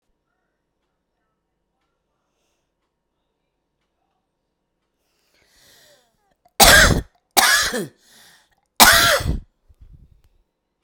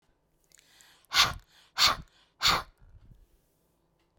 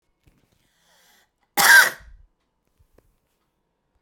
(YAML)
three_cough_length: 10.8 s
three_cough_amplitude: 32768
three_cough_signal_mean_std_ratio: 0.27
exhalation_length: 4.2 s
exhalation_amplitude: 14581
exhalation_signal_mean_std_ratio: 0.3
cough_length: 4.0 s
cough_amplitude: 31892
cough_signal_mean_std_ratio: 0.23
survey_phase: beta (2021-08-13 to 2022-03-07)
age: 45-64
gender: Female
wearing_mask: 'No'
symptom_cough_any: true
symptom_runny_or_blocked_nose: true
smoker_status: Current smoker (1 to 10 cigarettes per day)
respiratory_condition_asthma: false
respiratory_condition_other: false
recruitment_source: REACT
submission_delay: 1 day
covid_test_result: Negative
covid_test_method: RT-qPCR